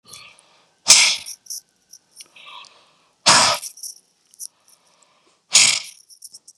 {"exhalation_length": "6.6 s", "exhalation_amplitude": 32768, "exhalation_signal_mean_std_ratio": 0.31, "survey_phase": "beta (2021-08-13 to 2022-03-07)", "age": "45-64", "gender": "Male", "wearing_mask": "No", "symptom_none": true, "smoker_status": "Current smoker (1 to 10 cigarettes per day)", "respiratory_condition_asthma": false, "respiratory_condition_other": false, "recruitment_source": "REACT", "submission_delay": "1 day", "covid_test_result": "Negative", "covid_test_method": "RT-qPCR", "influenza_a_test_result": "Negative", "influenza_b_test_result": "Negative"}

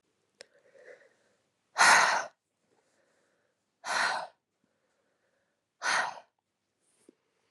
{"exhalation_length": "7.5 s", "exhalation_amplitude": 11755, "exhalation_signal_mean_std_ratio": 0.28, "survey_phase": "beta (2021-08-13 to 2022-03-07)", "age": "18-44", "gender": "Female", "wearing_mask": "No", "symptom_cough_any": true, "symptom_runny_or_blocked_nose": true, "symptom_sore_throat": true, "symptom_fatigue": true, "symptom_headache": true, "symptom_other": true, "symptom_onset": "3 days", "smoker_status": "Never smoked", "respiratory_condition_asthma": false, "respiratory_condition_other": false, "recruitment_source": "Test and Trace", "submission_delay": "1 day", "covid_test_result": "Positive", "covid_test_method": "RT-qPCR", "covid_ct_value": 23.2, "covid_ct_gene": "ORF1ab gene", "covid_ct_mean": 23.5, "covid_viral_load": "19000 copies/ml", "covid_viral_load_category": "Low viral load (10K-1M copies/ml)"}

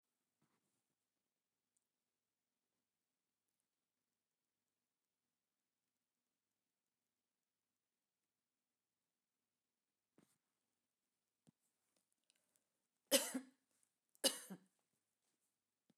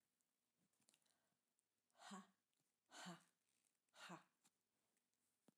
{"cough_length": "16.0 s", "cough_amplitude": 4078, "cough_signal_mean_std_ratio": 0.11, "exhalation_length": "5.6 s", "exhalation_amplitude": 197, "exhalation_signal_mean_std_ratio": 0.33, "survey_phase": "alpha (2021-03-01 to 2021-08-12)", "age": "45-64", "gender": "Female", "wearing_mask": "No", "symptom_none": true, "smoker_status": "Never smoked", "respiratory_condition_asthma": false, "respiratory_condition_other": false, "recruitment_source": "REACT", "submission_delay": "2 days", "covid_test_result": "Negative", "covid_test_method": "RT-qPCR"}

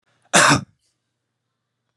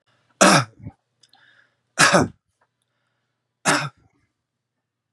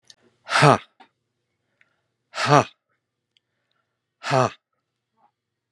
{"cough_length": "2.0 s", "cough_amplitude": 32385, "cough_signal_mean_std_ratio": 0.3, "three_cough_length": "5.1 s", "three_cough_amplitude": 32250, "three_cough_signal_mean_std_ratio": 0.29, "exhalation_length": "5.7 s", "exhalation_amplitude": 32762, "exhalation_signal_mean_std_ratio": 0.24, "survey_phase": "beta (2021-08-13 to 2022-03-07)", "age": "65+", "gender": "Male", "wearing_mask": "No", "symptom_none": true, "smoker_status": "Never smoked", "respiratory_condition_asthma": false, "respiratory_condition_other": false, "recruitment_source": "REACT", "submission_delay": "2 days", "covid_test_result": "Negative", "covid_test_method": "RT-qPCR", "influenza_a_test_result": "Negative", "influenza_b_test_result": "Negative"}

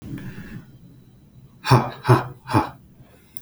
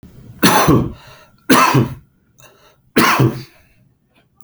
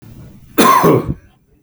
{"exhalation_length": "3.4 s", "exhalation_amplitude": 27459, "exhalation_signal_mean_std_ratio": 0.36, "three_cough_length": "4.4 s", "three_cough_amplitude": 32768, "three_cough_signal_mean_std_ratio": 0.46, "cough_length": "1.6 s", "cough_amplitude": 32768, "cough_signal_mean_std_ratio": 0.52, "survey_phase": "beta (2021-08-13 to 2022-03-07)", "age": "45-64", "gender": "Male", "wearing_mask": "No", "symptom_none": true, "smoker_status": "Current smoker (1 to 10 cigarettes per day)", "respiratory_condition_asthma": false, "respiratory_condition_other": false, "recruitment_source": "REACT", "submission_delay": "3 days", "covid_test_result": "Negative", "covid_test_method": "RT-qPCR"}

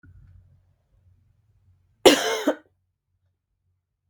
{"cough_length": "4.1 s", "cough_amplitude": 32768, "cough_signal_mean_std_ratio": 0.21, "survey_phase": "beta (2021-08-13 to 2022-03-07)", "age": "18-44", "gender": "Female", "wearing_mask": "No", "symptom_cough_any": true, "symptom_runny_or_blocked_nose": true, "symptom_sore_throat": true, "symptom_diarrhoea": true, "symptom_other": true, "smoker_status": "Never smoked", "respiratory_condition_asthma": false, "respiratory_condition_other": false, "recruitment_source": "Test and Trace", "submission_delay": "1 day", "covid_test_result": "Positive", "covid_test_method": "RT-qPCR", "covid_ct_value": 30.0, "covid_ct_gene": "N gene"}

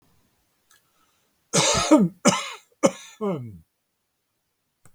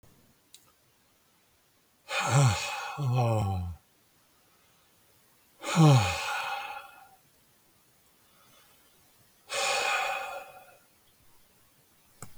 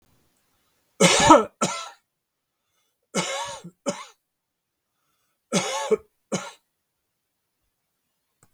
{"cough_length": "4.9 s", "cough_amplitude": 28206, "cough_signal_mean_std_ratio": 0.35, "exhalation_length": "12.4 s", "exhalation_amplitude": 11240, "exhalation_signal_mean_std_ratio": 0.41, "three_cough_length": "8.5 s", "three_cough_amplitude": 32768, "three_cough_signal_mean_std_ratio": 0.28, "survey_phase": "beta (2021-08-13 to 2022-03-07)", "age": "65+", "gender": "Male", "wearing_mask": "No", "symptom_none": true, "smoker_status": "Ex-smoker", "respiratory_condition_asthma": false, "respiratory_condition_other": false, "recruitment_source": "REACT", "submission_delay": "2 days", "covid_test_result": "Negative", "covid_test_method": "RT-qPCR", "influenza_a_test_result": "Unknown/Void", "influenza_b_test_result": "Unknown/Void"}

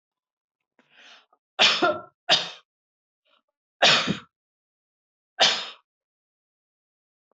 {"three_cough_length": "7.3 s", "three_cough_amplitude": 20550, "three_cough_signal_mean_std_ratio": 0.29, "survey_phase": "beta (2021-08-13 to 2022-03-07)", "age": "45-64", "gender": "Female", "wearing_mask": "No", "symptom_none": true, "symptom_onset": "12 days", "smoker_status": "Never smoked", "respiratory_condition_asthma": false, "respiratory_condition_other": false, "recruitment_source": "REACT", "submission_delay": "1 day", "covid_test_result": "Negative", "covid_test_method": "RT-qPCR"}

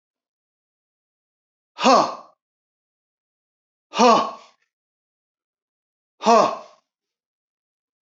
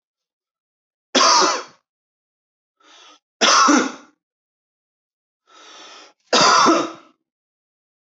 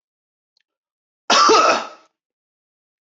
{"exhalation_length": "8.0 s", "exhalation_amplitude": 26121, "exhalation_signal_mean_std_ratio": 0.26, "three_cough_length": "8.2 s", "three_cough_amplitude": 26049, "three_cough_signal_mean_std_ratio": 0.36, "cough_length": "3.1 s", "cough_amplitude": 24835, "cough_signal_mean_std_ratio": 0.35, "survey_phase": "beta (2021-08-13 to 2022-03-07)", "age": "18-44", "gender": "Male", "wearing_mask": "No", "symptom_none": true, "smoker_status": "Never smoked", "respiratory_condition_asthma": false, "respiratory_condition_other": false, "recruitment_source": "REACT", "submission_delay": "1 day", "covid_test_result": "Negative", "covid_test_method": "RT-qPCR", "influenza_a_test_result": "Negative", "influenza_b_test_result": "Negative"}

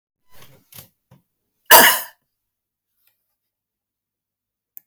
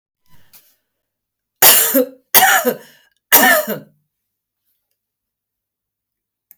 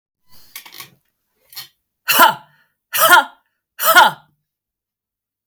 {"cough_length": "4.9 s", "cough_amplitude": 32768, "cough_signal_mean_std_ratio": 0.19, "three_cough_length": "6.6 s", "three_cough_amplitude": 32768, "three_cough_signal_mean_std_ratio": 0.34, "exhalation_length": "5.5 s", "exhalation_amplitude": 32768, "exhalation_signal_mean_std_ratio": 0.32, "survey_phase": "beta (2021-08-13 to 2022-03-07)", "age": "45-64", "gender": "Female", "wearing_mask": "No", "symptom_none": true, "symptom_onset": "12 days", "smoker_status": "Never smoked", "respiratory_condition_asthma": false, "respiratory_condition_other": false, "recruitment_source": "REACT", "submission_delay": "1 day", "covid_test_result": "Negative", "covid_test_method": "RT-qPCR", "influenza_a_test_result": "Negative", "influenza_b_test_result": "Negative"}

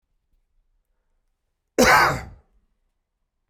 {"cough_length": "3.5 s", "cough_amplitude": 22152, "cough_signal_mean_std_ratio": 0.27, "survey_phase": "beta (2021-08-13 to 2022-03-07)", "age": "45-64", "gender": "Male", "wearing_mask": "No", "symptom_runny_or_blocked_nose": true, "smoker_status": "Ex-smoker", "respiratory_condition_asthma": true, "respiratory_condition_other": false, "recruitment_source": "Test and Trace", "submission_delay": "2 days", "covid_test_result": "Negative", "covid_test_method": "RT-qPCR"}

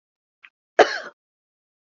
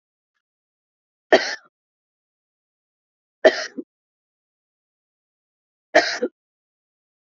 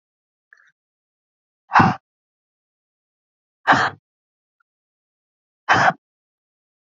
{"cough_length": "2.0 s", "cough_amplitude": 27963, "cough_signal_mean_std_ratio": 0.18, "three_cough_length": "7.3 s", "three_cough_amplitude": 28434, "three_cough_signal_mean_std_ratio": 0.19, "exhalation_length": "7.0 s", "exhalation_amplitude": 27362, "exhalation_signal_mean_std_ratio": 0.23, "survey_phase": "beta (2021-08-13 to 2022-03-07)", "age": "45-64", "gender": "Female", "wearing_mask": "No", "symptom_none": true, "smoker_status": "Never smoked", "respiratory_condition_asthma": false, "respiratory_condition_other": false, "recruitment_source": "REACT", "submission_delay": "1 day", "covid_test_result": "Negative", "covid_test_method": "RT-qPCR", "influenza_a_test_result": "Negative", "influenza_b_test_result": "Negative"}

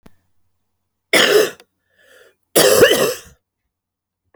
{"cough_length": "4.4 s", "cough_amplitude": 32768, "cough_signal_mean_std_ratio": 0.38, "survey_phase": "alpha (2021-03-01 to 2021-08-12)", "age": "45-64", "gender": "Female", "wearing_mask": "No", "symptom_cough_any": true, "symptom_abdominal_pain": true, "symptom_fatigue": true, "symptom_change_to_sense_of_smell_or_taste": true, "smoker_status": "Never smoked", "respiratory_condition_asthma": false, "respiratory_condition_other": false, "recruitment_source": "Test and Trace", "submission_delay": "2 days", "covid_test_result": "Positive", "covid_test_method": "RT-qPCR", "covid_ct_value": 16.2, "covid_ct_gene": "ORF1ab gene", "covid_ct_mean": 16.5, "covid_viral_load": "4000000 copies/ml", "covid_viral_load_category": "High viral load (>1M copies/ml)"}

